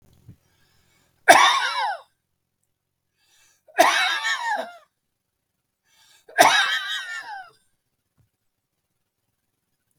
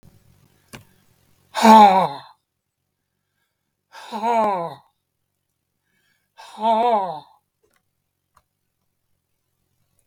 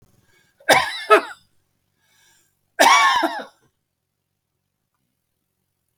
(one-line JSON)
{"three_cough_length": "10.0 s", "three_cough_amplitude": 32768, "three_cough_signal_mean_std_ratio": 0.33, "exhalation_length": "10.1 s", "exhalation_amplitude": 32766, "exhalation_signal_mean_std_ratio": 0.29, "cough_length": "6.0 s", "cough_amplitude": 32768, "cough_signal_mean_std_ratio": 0.31, "survey_phase": "beta (2021-08-13 to 2022-03-07)", "age": "65+", "gender": "Male", "wearing_mask": "No", "symptom_none": true, "smoker_status": "Never smoked", "respiratory_condition_asthma": false, "respiratory_condition_other": false, "recruitment_source": "REACT", "submission_delay": "2 days", "covid_test_result": "Negative", "covid_test_method": "RT-qPCR", "influenza_a_test_result": "Negative", "influenza_b_test_result": "Negative"}